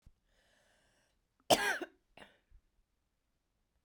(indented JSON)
{
  "cough_length": "3.8 s",
  "cough_amplitude": 7764,
  "cough_signal_mean_std_ratio": 0.2,
  "survey_phase": "beta (2021-08-13 to 2022-03-07)",
  "age": "45-64",
  "gender": "Female",
  "wearing_mask": "No",
  "symptom_cough_any": true,
  "symptom_runny_or_blocked_nose": true,
  "symptom_shortness_of_breath": true,
  "symptom_fatigue": true,
  "symptom_onset": "3 days",
  "smoker_status": "Never smoked",
  "respiratory_condition_asthma": true,
  "respiratory_condition_other": false,
  "recruitment_source": "Test and Trace",
  "submission_delay": "2 days",
  "covid_test_result": "Positive",
  "covid_test_method": "RT-qPCR"
}